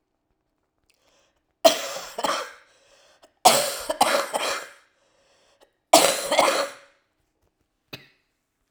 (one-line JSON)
{"three_cough_length": "8.7 s", "three_cough_amplitude": 32768, "three_cough_signal_mean_std_ratio": 0.35, "survey_phase": "alpha (2021-03-01 to 2021-08-12)", "age": "65+", "gender": "Female", "wearing_mask": "No", "symptom_cough_any": true, "symptom_onset": "3 days", "smoker_status": "Never smoked", "respiratory_condition_asthma": false, "respiratory_condition_other": false, "recruitment_source": "Test and Trace", "submission_delay": "2 days", "covid_test_result": "Positive", "covid_test_method": "RT-qPCR", "covid_ct_value": 23.3, "covid_ct_gene": "N gene", "covid_ct_mean": 23.4, "covid_viral_load": "21000 copies/ml", "covid_viral_load_category": "Low viral load (10K-1M copies/ml)"}